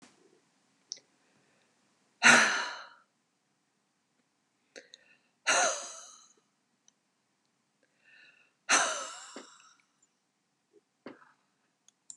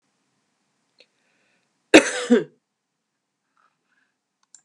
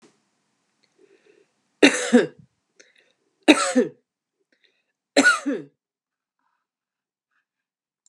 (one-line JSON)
{"exhalation_length": "12.2 s", "exhalation_amplitude": 16840, "exhalation_signal_mean_std_ratio": 0.24, "cough_length": "4.6 s", "cough_amplitude": 32768, "cough_signal_mean_std_ratio": 0.18, "three_cough_length": "8.1 s", "three_cough_amplitude": 32424, "three_cough_signal_mean_std_ratio": 0.26, "survey_phase": "beta (2021-08-13 to 2022-03-07)", "age": "45-64", "gender": "Female", "wearing_mask": "No", "symptom_none": true, "smoker_status": "Ex-smoker", "respiratory_condition_asthma": false, "respiratory_condition_other": false, "recruitment_source": "REACT", "submission_delay": "3 days", "covid_test_result": "Negative", "covid_test_method": "RT-qPCR", "influenza_a_test_result": "Negative", "influenza_b_test_result": "Negative"}